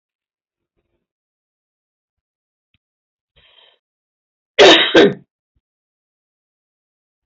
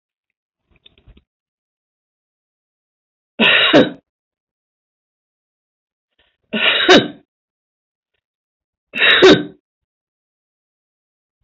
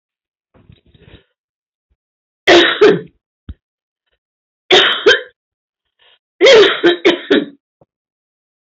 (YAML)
cough_length: 7.3 s
cough_amplitude: 32700
cough_signal_mean_std_ratio: 0.21
exhalation_length: 11.4 s
exhalation_amplitude: 32146
exhalation_signal_mean_std_ratio: 0.28
three_cough_length: 8.7 s
three_cough_amplitude: 32768
three_cough_signal_mean_std_ratio: 0.37
survey_phase: alpha (2021-03-01 to 2021-08-12)
age: 65+
gender: Female
wearing_mask: 'No'
symptom_none: true
smoker_status: Never smoked
respiratory_condition_asthma: false
respiratory_condition_other: true
recruitment_source: REACT
submission_delay: 1 day
covid_test_result: Negative
covid_test_method: RT-qPCR